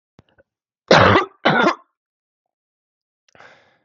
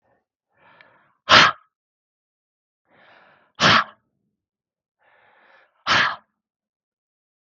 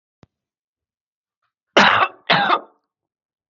{"three_cough_length": "3.8 s", "three_cough_amplitude": 32768, "three_cough_signal_mean_std_ratio": 0.32, "exhalation_length": "7.5 s", "exhalation_amplitude": 32768, "exhalation_signal_mean_std_ratio": 0.24, "cough_length": "3.5 s", "cough_amplitude": 32768, "cough_signal_mean_std_ratio": 0.33, "survey_phase": "beta (2021-08-13 to 2022-03-07)", "age": "45-64", "gender": "Female", "wearing_mask": "No", "symptom_cough_any": true, "symptom_runny_or_blocked_nose": true, "smoker_status": "Ex-smoker", "respiratory_condition_asthma": false, "respiratory_condition_other": false, "recruitment_source": "REACT", "submission_delay": "2 days", "covid_test_result": "Positive", "covid_test_method": "RT-qPCR", "covid_ct_value": 29.0, "covid_ct_gene": "N gene", "influenza_a_test_result": "Negative", "influenza_b_test_result": "Negative"}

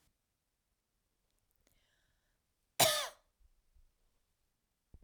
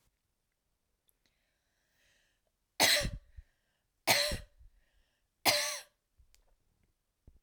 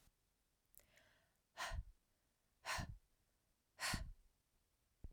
{"cough_length": "5.0 s", "cough_amplitude": 6383, "cough_signal_mean_std_ratio": 0.18, "three_cough_length": "7.4 s", "three_cough_amplitude": 7876, "three_cough_signal_mean_std_ratio": 0.28, "exhalation_length": "5.1 s", "exhalation_amplitude": 1099, "exhalation_signal_mean_std_ratio": 0.37, "survey_phase": "alpha (2021-03-01 to 2021-08-12)", "age": "18-44", "gender": "Female", "wearing_mask": "No", "symptom_none": true, "smoker_status": "Never smoked", "respiratory_condition_asthma": false, "respiratory_condition_other": false, "recruitment_source": "REACT", "submission_delay": "2 days", "covid_test_result": "Negative", "covid_test_method": "RT-qPCR"}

